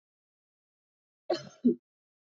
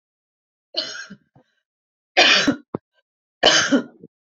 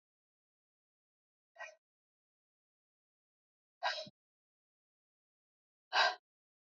{"cough_length": "2.3 s", "cough_amplitude": 5620, "cough_signal_mean_std_ratio": 0.22, "three_cough_length": "4.4 s", "three_cough_amplitude": 30076, "three_cough_signal_mean_std_ratio": 0.36, "exhalation_length": "6.7 s", "exhalation_amplitude": 4650, "exhalation_signal_mean_std_ratio": 0.18, "survey_phase": "beta (2021-08-13 to 2022-03-07)", "age": "45-64", "gender": "Female", "wearing_mask": "No", "symptom_none": true, "smoker_status": "Ex-smoker", "respiratory_condition_asthma": false, "respiratory_condition_other": false, "recruitment_source": "REACT", "submission_delay": "0 days", "covid_test_result": "Negative", "covid_test_method": "RT-qPCR", "influenza_a_test_result": "Negative", "influenza_b_test_result": "Negative"}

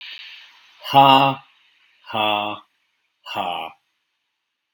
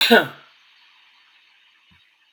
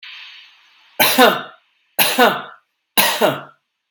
{"exhalation_length": "4.7 s", "exhalation_amplitude": 32768, "exhalation_signal_mean_std_ratio": 0.35, "cough_length": "2.3 s", "cough_amplitude": 32767, "cough_signal_mean_std_ratio": 0.25, "three_cough_length": "3.9 s", "three_cough_amplitude": 32767, "three_cough_signal_mean_std_ratio": 0.44, "survey_phase": "beta (2021-08-13 to 2022-03-07)", "age": "45-64", "gender": "Male", "wearing_mask": "No", "symptom_runny_or_blocked_nose": true, "smoker_status": "Never smoked", "respiratory_condition_asthma": false, "respiratory_condition_other": false, "recruitment_source": "Test and Trace", "submission_delay": "1 day", "covid_test_result": "Positive", "covid_test_method": "ePCR"}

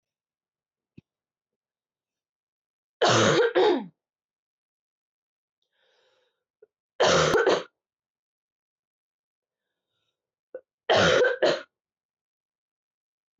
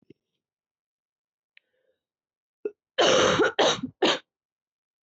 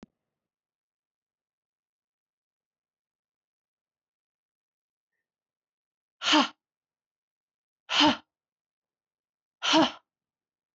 {"three_cough_length": "13.4 s", "three_cough_amplitude": 12125, "three_cough_signal_mean_std_ratio": 0.32, "cough_length": "5.0 s", "cough_amplitude": 14141, "cough_signal_mean_std_ratio": 0.35, "exhalation_length": "10.8 s", "exhalation_amplitude": 13145, "exhalation_signal_mean_std_ratio": 0.2, "survey_phase": "alpha (2021-03-01 to 2021-08-12)", "age": "18-44", "gender": "Female", "wearing_mask": "No", "symptom_cough_any": true, "symptom_abdominal_pain": true, "symptom_fatigue": true, "symptom_headache": true, "symptom_onset": "3 days", "smoker_status": "Never smoked", "respiratory_condition_asthma": true, "respiratory_condition_other": false, "recruitment_source": "Test and Trace", "submission_delay": "1 day", "covid_test_result": "Positive", "covid_test_method": "RT-qPCR", "covid_ct_value": 20.6, "covid_ct_gene": "ORF1ab gene"}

